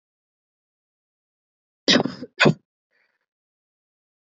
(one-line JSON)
{"cough_length": "4.4 s", "cough_amplitude": 25225, "cough_signal_mean_std_ratio": 0.21, "survey_phase": "beta (2021-08-13 to 2022-03-07)", "age": "18-44", "gender": "Female", "wearing_mask": "No", "symptom_cough_any": true, "symptom_runny_or_blocked_nose": true, "symptom_sore_throat": true, "symptom_fatigue": true, "symptom_fever_high_temperature": true, "symptom_headache": true, "symptom_other": true, "symptom_onset": "3 days", "smoker_status": "Ex-smoker", "respiratory_condition_asthma": false, "respiratory_condition_other": false, "recruitment_source": "Test and Trace", "submission_delay": "2 days", "covid_test_result": "Positive", "covid_test_method": "ePCR"}